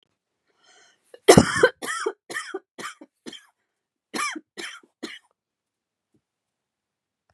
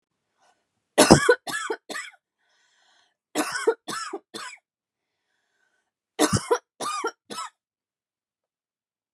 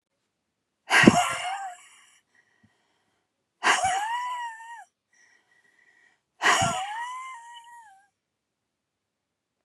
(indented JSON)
{
  "cough_length": "7.3 s",
  "cough_amplitude": 32768,
  "cough_signal_mean_std_ratio": 0.22,
  "three_cough_length": "9.1 s",
  "three_cough_amplitude": 32767,
  "three_cough_signal_mean_std_ratio": 0.28,
  "exhalation_length": "9.6 s",
  "exhalation_amplitude": 32767,
  "exhalation_signal_mean_std_ratio": 0.35,
  "survey_phase": "beta (2021-08-13 to 2022-03-07)",
  "age": "45-64",
  "gender": "Female",
  "wearing_mask": "No",
  "symptom_none": true,
  "smoker_status": "Never smoked",
  "respiratory_condition_asthma": false,
  "respiratory_condition_other": false,
  "recruitment_source": "REACT",
  "submission_delay": "2 days",
  "covid_test_result": "Negative",
  "covid_test_method": "RT-qPCR",
  "influenza_a_test_result": "Negative",
  "influenza_b_test_result": "Negative"
}